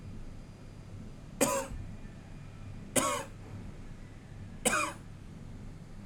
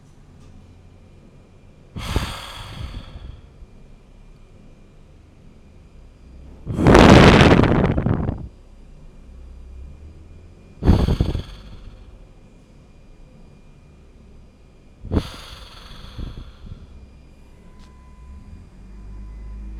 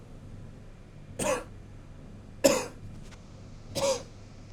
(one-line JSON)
{"three_cough_length": "6.1 s", "three_cough_amplitude": 9119, "three_cough_signal_mean_std_ratio": 0.63, "exhalation_length": "19.8 s", "exhalation_amplitude": 32768, "exhalation_signal_mean_std_ratio": 0.33, "cough_length": "4.5 s", "cough_amplitude": 16538, "cough_signal_mean_std_ratio": 0.48, "survey_phase": "alpha (2021-03-01 to 2021-08-12)", "age": "18-44", "gender": "Male", "wearing_mask": "Yes", "symptom_none": true, "smoker_status": "Current smoker (1 to 10 cigarettes per day)", "respiratory_condition_asthma": true, "respiratory_condition_other": false, "recruitment_source": "REACT", "submission_delay": "3 days", "covid_test_result": "Negative", "covid_test_method": "RT-qPCR"}